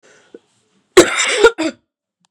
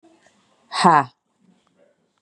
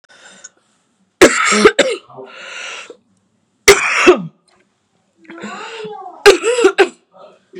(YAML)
cough_length: 2.3 s
cough_amplitude: 32768
cough_signal_mean_std_ratio: 0.36
exhalation_length: 2.2 s
exhalation_amplitude: 31803
exhalation_signal_mean_std_ratio: 0.26
three_cough_length: 7.6 s
three_cough_amplitude: 32768
three_cough_signal_mean_std_ratio: 0.39
survey_phase: beta (2021-08-13 to 2022-03-07)
age: 18-44
gender: Female
wearing_mask: 'No'
symptom_cough_any: true
symptom_runny_or_blocked_nose: true
symptom_fatigue: true
symptom_headache: true
symptom_change_to_sense_of_smell_or_taste: true
symptom_onset: 3 days
smoker_status: Never smoked
respiratory_condition_asthma: false
respiratory_condition_other: false
recruitment_source: Test and Trace
submission_delay: 1 day
covid_test_result: Positive
covid_test_method: ePCR